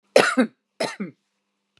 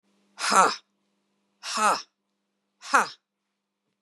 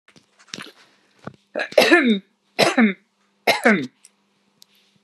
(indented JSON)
{
  "cough_length": "1.8 s",
  "cough_amplitude": 30715,
  "cough_signal_mean_std_ratio": 0.34,
  "exhalation_length": "4.0 s",
  "exhalation_amplitude": 20501,
  "exhalation_signal_mean_std_ratio": 0.32,
  "three_cough_length": "5.0 s",
  "three_cough_amplitude": 32098,
  "three_cough_signal_mean_std_ratio": 0.38,
  "survey_phase": "beta (2021-08-13 to 2022-03-07)",
  "age": "65+",
  "gender": "Female",
  "wearing_mask": "No",
  "symptom_none": true,
  "smoker_status": "Ex-smoker",
  "respiratory_condition_asthma": false,
  "respiratory_condition_other": false,
  "recruitment_source": "REACT",
  "submission_delay": "0 days",
  "covid_test_result": "Negative",
  "covid_test_method": "RT-qPCR",
  "influenza_a_test_result": "Negative",
  "influenza_b_test_result": "Negative"
}